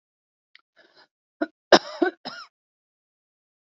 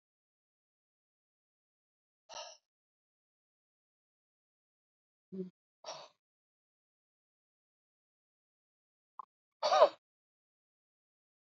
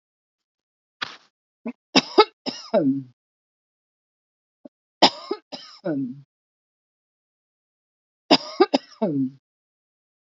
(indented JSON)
{
  "cough_length": "3.8 s",
  "cough_amplitude": 30158,
  "cough_signal_mean_std_ratio": 0.17,
  "exhalation_length": "11.5 s",
  "exhalation_amplitude": 9487,
  "exhalation_signal_mean_std_ratio": 0.13,
  "three_cough_length": "10.3 s",
  "three_cough_amplitude": 30482,
  "three_cough_signal_mean_std_ratio": 0.26,
  "survey_phase": "alpha (2021-03-01 to 2021-08-12)",
  "age": "45-64",
  "gender": "Female",
  "wearing_mask": "No",
  "symptom_none": true,
  "symptom_onset": "6 days",
  "smoker_status": "Ex-smoker",
  "respiratory_condition_asthma": true,
  "respiratory_condition_other": false,
  "recruitment_source": "REACT",
  "submission_delay": "1 day",
  "covid_test_result": "Negative",
  "covid_test_method": "RT-qPCR"
}